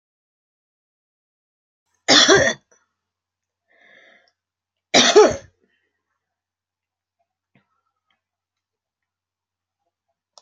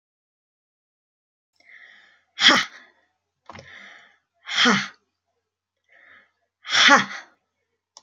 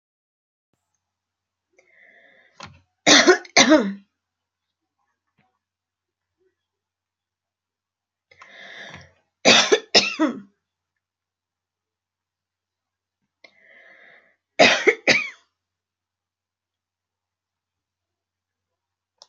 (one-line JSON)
{"cough_length": "10.4 s", "cough_amplitude": 32767, "cough_signal_mean_std_ratio": 0.22, "exhalation_length": "8.0 s", "exhalation_amplitude": 30628, "exhalation_signal_mean_std_ratio": 0.27, "three_cough_length": "19.3 s", "three_cough_amplitude": 32767, "three_cough_signal_mean_std_ratio": 0.23, "survey_phase": "alpha (2021-03-01 to 2021-08-12)", "age": "65+", "gender": "Female", "wearing_mask": "No", "symptom_none": true, "smoker_status": "Never smoked", "respiratory_condition_asthma": false, "respiratory_condition_other": false, "recruitment_source": "REACT", "submission_delay": "3 days", "covid_test_result": "Negative", "covid_test_method": "RT-qPCR"}